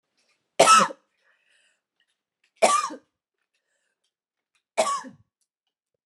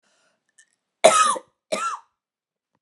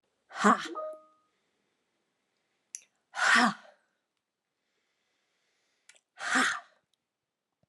{"three_cough_length": "6.1 s", "three_cough_amplitude": 22308, "three_cough_signal_mean_std_ratio": 0.26, "cough_length": "2.8 s", "cough_amplitude": 32745, "cough_signal_mean_std_ratio": 0.31, "exhalation_length": "7.7 s", "exhalation_amplitude": 14874, "exhalation_signal_mean_std_ratio": 0.29, "survey_phase": "beta (2021-08-13 to 2022-03-07)", "age": "45-64", "gender": "Female", "wearing_mask": "No", "symptom_cough_any": true, "symptom_runny_or_blocked_nose": true, "symptom_sore_throat": true, "symptom_fatigue": true, "symptom_headache": true, "symptom_change_to_sense_of_smell_or_taste": true, "symptom_loss_of_taste": true, "symptom_onset": "5 days", "smoker_status": "Never smoked", "respiratory_condition_asthma": false, "respiratory_condition_other": false, "recruitment_source": "Test and Trace", "submission_delay": "2 days", "covid_test_result": "Positive", "covid_test_method": "RT-qPCR", "covid_ct_value": 11.7, "covid_ct_gene": "ORF1ab gene", "covid_ct_mean": 11.9, "covid_viral_load": "120000000 copies/ml", "covid_viral_load_category": "High viral load (>1M copies/ml)"}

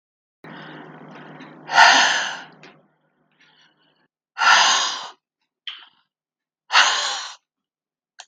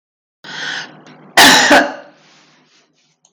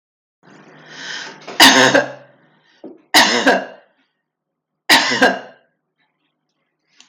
{"exhalation_length": "8.3 s", "exhalation_amplitude": 32768, "exhalation_signal_mean_std_ratio": 0.36, "cough_length": "3.3 s", "cough_amplitude": 32768, "cough_signal_mean_std_ratio": 0.39, "three_cough_length": "7.1 s", "three_cough_amplitude": 32768, "three_cough_signal_mean_std_ratio": 0.37, "survey_phase": "beta (2021-08-13 to 2022-03-07)", "age": "65+", "gender": "Female", "wearing_mask": "No", "symptom_none": true, "smoker_status": "Never smoked", "respiratory_condition_asthma": false, "respiratory_condition_other": false, "recruitment_source": "REACT", "submission_delay": "1 day", "covid_test_result": "Negative", "covid_test_method": "RT-qPCR"}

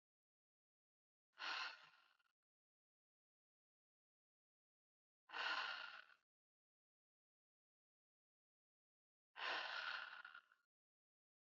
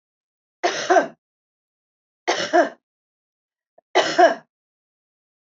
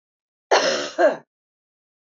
{"exhalation_length": "11.4 s", "exhalation_amplitude": 753, "exhalation_signal_mean_std_ratio": 0.32, "three_cough_length": "5.5 s", "three_cough_amplitude": 25640, "three_cough_signal_mean_std_ratio": 0.32, "cough_length": "2.1 s", "cough_amplitude": 23391, "cough_signal_mean_std_ratio": 0.39, "survey_phase": "beta (2021-08-13 to 2022-03-07)", "age": "45-64", "gender": "Female", "wearing_mask": "No", "symptom_none": true, "smoker_status": "Never smoked", "respiratory_condition_asthma": false, "respiratory_condition_other": false, "recruitment_source": "REACT", "submission_delay": "2 days", "covid_test_result": "Negative", "covid_test_method": "RT-qPCR", "influenza_a_test_result": "Negative", "influenza_b_test_result": "Negative"}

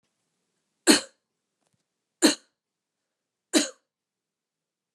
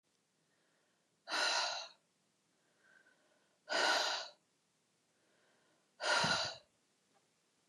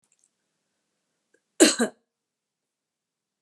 {"three_cough_length": "4.9 s", "three_cough_amplitude": 22903, "three_cough_signal_mean_std_ratio": 0.2, "exhalation_length": "7.7 s", "exhalation_amplitude": 3184, "exhalation_signal_mean_std_ratio": 0.38, "cough_length": "3.4 s", "cough_amplitude": 27150, "cough_signal_mean_std_ratio": 0.18, "survey_phase": "alpha (2021-03-01 to 2021-08-12)", "age": "65+", "gender": "Female", "wearing_mask": "No", "symptom_none": true, "smoker_status": "Never smoked", "respiratory_condition_asthma": false, "respiratory_condition_other": false, "recruitment_source": "REACT", "submission_delay": "2 days", "covid_test_result": "Negative", "covid_test_method": "RT-qPCR"}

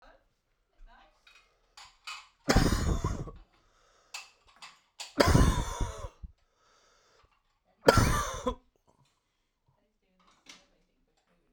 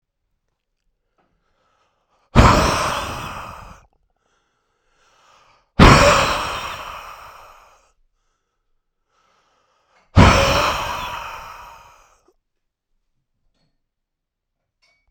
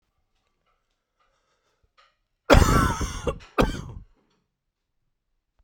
{"three_cough_length": "11.5 s", "three_cough_amplitude": 25216, "three_cough_signal_mean_std_ratio": 0.32, "exhalation_length": "15.1 s", "exhalation_amplitude": 32768, "exhalation_signal_mean_std_ratio": 0.3, "cough_length": "5.6 s", "cough_amplitude": 32348, "cough_signal_mean_std_ratio": 0.28, "survey_phase": "beta (2021-08-13 to 2022-03-07)", "age": "45-64", "gender": "Male", "wearing_mask": "No", "symptom_new_continuous_cough": true, "symptom_runny_or_blocked_nose": true, "symptom_shortness_of_breath": true, "symptom_sore_throat": true, "symptom_abdominal_pain": true, "symptom_fatigue": true, "symptom_headache": true, "symptom_change_to_sense_of_smell_or_taste": true, "smoker_status": "Ex-smoker", "respiratory_condition_asthma": false, "respiratory_condition_other": false, "recruitment_source": "Test and Trace", "submission_delay": "1 day", "covid_test_result": "Positive", "covid_test_method": "RT-qPCR", "covid_ct_value": 22.0, "covid_ct_gene": "ORF1ab gene"}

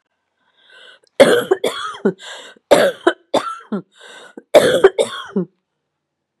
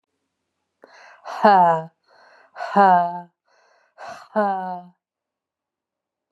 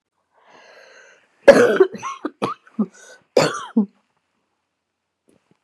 {"three_cough_length": "6.4 s", "three_cough_amplitude": 32768, "three_cough_signal_mean_std_ratio": 0.39, "exhalation_length": "6.3 s", "exhalation_amplitude": 26732, "exhalation_signal_mean_std_ratio": 0.35, "cough_length": "5.6 s", "cough_amplitude": 32768, "cough_signal_mean_std_ratio": 0.29, "survey_phase": "beta (2021-08-13 to 2022-03-07)", "age": "45-64", "gender": "Female", "wearing_mask": "No", "symptom_cough_any": true, "symptom_sore_throat": true, "symptom_change_to_sense_of_smell_or_taste": true, "symptom_loss_of_taste": true, "symptom_onset": "12 days", "smoker_status": "Ex-smoker", "respiratory_condition_asthma": false, "respiratory_condition_other": false, "recruitment_source": "REACT", "submission_delay": "2 days", "covid_test_result": "Negative", "covid_test_method": "RT-qPCR", "influenza_a_test_result": "Negative", "influenza_b_test_result": "Negative"}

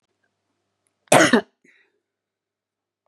{"cough_length": "3.1 s", "cough_amplitude": 32131, "cough_signal_mean_std_ratio": 0.23, "survey_phase": "beta (2021-08-13 to 2022-03-07)", "age": "45-64", "gender": "Female", "wearing_mask": "No", "symptom_cough_any": true, "symptom_runny_or_blocked_nose": true, "symptom_sore_throat": true, "symptom_fatigue": true, "symptom_headache": true, "symptom_onset": "3 days", "smoker_status": "Never smoked", "respiratory_condition_asthma": true, "respiratory_condition_other": false, "recruitment_source": "Test and Trace", "submission_delay": "1 day", "covid_test_result": "Positive", "covid_test_method": "RT-qPCR", "covid_ct_value": 23.8, "covid_ct_gene": "N gene"}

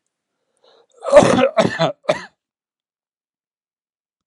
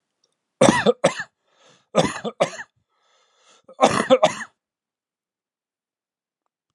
{"cough_length": "4.3 s", "cough_amplitude": 32768, "cough_signal_mean_std_ratio": 0.31, "three_cough_length": "6.7 s", "three_cough_amplitude": 32661, "three_cough_signal_mean_std_ratio": 0.3, "survey_phase": "alpha (2021-03-01 to 2021-08-12)", "age": "45-64", "gender": "Male", "wearing_mask": "No", "symptom_fatigue": true, "symptom_onset": "4 days", "smoker_status": "Never smoked", "respiratory_condition_asthma": true, "respiratory_condition_other": false, "recruitment_source": "Test and Trace", "submission_delay": "2 days", "covid_test_result": "Positive", "covid_test_method": "RT-qPCR"}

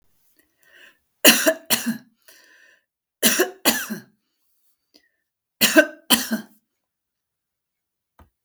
{"three_cough_length": "8.4 s", "three_cough_amplitude": 32768, "three_cough_signal_mean_std_ratio": 0.29, "survey_phase": "beta (2021-08-13 to 2022-03-07)", "age": "65+", "gender": "Female", "wearing_mask": "No", "symptom_none": true, "smoker_status": "Never smoked", "respiratory_condition_asthma": false, "respiratory_condition_other": false, "recruitment_source": "REACT", "submission_delay": "0 days", "covid_test_result": "Negative", "covid_test_method": "RT-qPCR", "influenza_a_test_result": "Negative", "influenza_b_test_result": "Negative"}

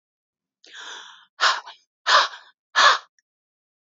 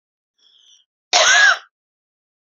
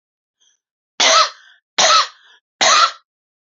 {"exhalation_length": "3.8 s", "exhalation_amplitude": 24345, "exhalation_signal_mean_std_ratio": 0.33, "cough_length": "2.5 s", "cough_amplitude": 28520, "cough_signal_mean_std_ratio": 0.36, "three_cough_length": "3.5 s", "three_cough_amplitude": 32767, "three_cough_signal_mean_std_ratio": 0.42, "survey_phase": "beta (2021-08-13 to 2022-03-07)", "age": "45-64", "gender": "Female", "wearing_mask": "No", "symptom_none": true, "symptom_onset": "13 days", "smoker_status": "Ex-smoker", "respiratory_condition_asthma": false, "respiratory_condition_other": false, "recruitment_source": "REACT", "submission_delay": "2 days", "covid_test_result": "Negative", "covid_test_method": "RT-qPCR", "influenza_a_test_result": "Negative", "influenza_b_test_result": "Negative"}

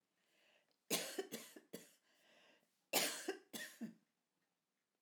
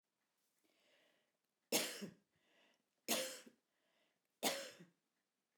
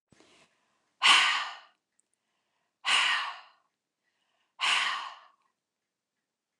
{"cough_length": "5.0 s", "cough_amplitude": 2713, "cough_signal_mean_std_ratio": 0.35, "three_cough_length": "5.6 s", "three_cough_amplitude": 2586, "three_cough_signal_mean_std_ratio": 0.3, "exhalation_length": "6.6 s", "exhalation_amplitude": 13998, "exhalation_signal_mean_std_ratio": 0.35, "survey_phase": "alpha (2021-03-01 to 2021-08-12)", "age": "65+", "gender": "Female", "wearing_mask": "No", "symptom_none": true, "smoker_status": "Never smoked", "respiratory_condition_asthma": false, "respiratory_condition_other": false, "recruitment_source": "REACT", "submission_delay": "2 days", "covid_test_result": "Negative", "covid_test_method": "RT-qPCR"}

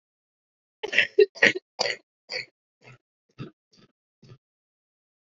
{"cough_length": "5.2 s", "cough_amplitude": 26500, "cough_signal_mean_std_ratio": 0.23, "survey_phase": "alpha (2021-03-01 to 2021-08-12)", "age": "18-44", "gender": "Female", "wearing_mask": "No", "symptom_cough_any": true, "symptom_change_to_sense_of_smell_or_taste": true, "symptom_loss_of_taste": true, "symptom_onset": "4 days", "smoker_status": "Never smoked", "respiratory_condition_asthma": false, "respiratory_condition_other": false, "recruitment_source": "Test and Trace", "submission_delay": "2 days", "covid_test_result": "Positive", "covid_test_method": "RT-qPCR", "covid_ct_value": 15.1, "covid_ct_gene": "ORF1ab gene", "covid_ct_mean": 15.5, "covid_viral_load": "8500000 copies/ml", "covid_viral_load_category": "High viral load (>1M copies/ml)"}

